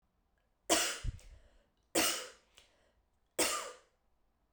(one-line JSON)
{"three_cough_length": "4.5 s", "three_cough_amplitude": 7198, "three_cough_signal_mean_std_ratio": 0.37, "survey_phase": "beta (2021-08-13 to 2022-03-07)", "age": "18-44", "gender": "Female", "wearing_mask": "No", "symptom_cough_any": true, "symptom_new_continuous_cough": true, "symptom_runny_or_blocked_nose": true, "symptom_sore_throat": true, "symptom_fever_high_temperature": true, "symptom_headache": true, "symptom_onset": "4 days", "smoker_status": "Never smoked", "respiratory_condition_asthma": false, "respiratory_condition_other": false, "recruitment_source": "Test and Trace", "submission_delay": "2 days", "covid_test_result": "Positive", "covid_test_method": "RT-qPCR", "covid_ct_value": 19.1, "covid_ct_gene": "ORF1ab gene"}